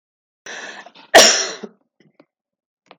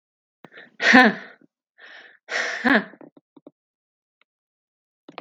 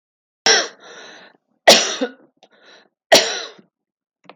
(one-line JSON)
{"cough_length": "3.0 s", "cough_amplitude": 32768, "cough_signal_mean_std_ratio": 0.28, "exhalation_length": "5.2 s", "exhalation_amplitude": 32768, "exhalation_signal_mean_std_ratio": 0.28, "three_cough_length": "4.4 s", "three_cough_amplitude": 32768, "three_cough_signal_mean_std_ratio": 0.32, "survey_phase": "beta (2021-08-13 to 2022-03-07)", "age": "65+", "gender": "Female", "wearing_mask": "No", "symptom_cough_any": true, "symptom_other": true, "smoker_status": "Never smoked", "respiratory_condition_asthma": false, "respiratory_condition_other": false, "recruitment_source": "Test and Trace", "submission_delay": "2 days", "covid_test_result": "Positive", "covid_test_method": "RT-qPCR", "covid_ct_value": 26.5, "covid_ct_gene": "ORF1ab gene", "covid_ct_mean": 27.3, "covid_viral_load": "1100 copies/ml", "covid_viral_load_category": "Minimal viral load (< 10K copies/ml)"}